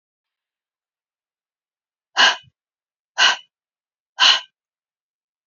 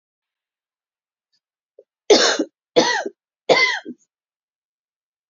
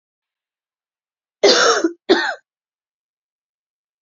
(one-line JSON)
{"exhalation_length": "5.5 s", "exhalation_amplitude": 27538, "exhalation_signal_mean_std_ratio": 0.25, "three_cough_length": "5.3 s", "three_cough_amplitude": 29785, "three_cough_signal_mean_std_ratio": 0.31, "cough_length": "4.0 s", "cough_amplitude": 30764, "cough_signal_mean_std_ratio": 0.32, "survey_phase": "beta (2021-08-13 to 2022-03-07)", "age": "45-64", "gender": "Female", "wearing_mask": "No", "symptom_cough_any": true, "symptom_runny_or_blocked_nose": true, "symptom_sore_throat": true, "symptom_fatigue": true, "smoker_status": "Never smoked", "respiratory_condition_asthma": true, "respiratory_condition_other": false, "recruitment_source": "Test and Trace", "submission_delay": "2 days", "covid_test_result": "Positive", "covid_test_method": "RT-qPCR", "covid_ct_value": 30.9, "covid_ct_gene": "ORF1ab gene", "covid_ct_mean": 31.8, "covid_viral_load": "38 copies/ml", "covid_viral_load_category": "Minimal viral load (< 10K copies/ml)"}